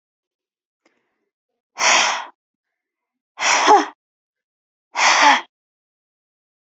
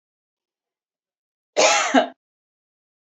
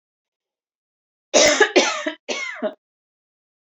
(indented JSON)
{
  "exhalation_length": "6.7 s",
  "exhalation_amplitude": 27859,
  "exhalation_signal_mean_std_ratio": 0.35,
  "cough_length": "3.2 s",
  "cough_amplitude": 25491,
  "cough_signal_mean_std_ratio": 0.3,
  "three_cough_length": "3.7 s",
  "three_cough_amplitude": 27746,
  "three_cough_signal_mean_std_ratio": 0.37,
  "survey_phase": "beta (2021-08-13 to 2022-03-07)",
  "age": "18-44",
  "gender": "Female",
  "wearing_mask": "Yes",
  "symptom_cough_any": true,
  "smoker_status": "Never smoked",
  "respiratory_condition_asthma": false,
  "respiratory_condition_other": false,
  "recruitment_source": "REACT",
  "submission_delay": "2 days",
  "covid_test_result": "Negative",
  "covid_test_method": "RT-qPCR",
  "influenza_a_test_result": "Negative",
  "influenza_b_test_result": "Negative"
}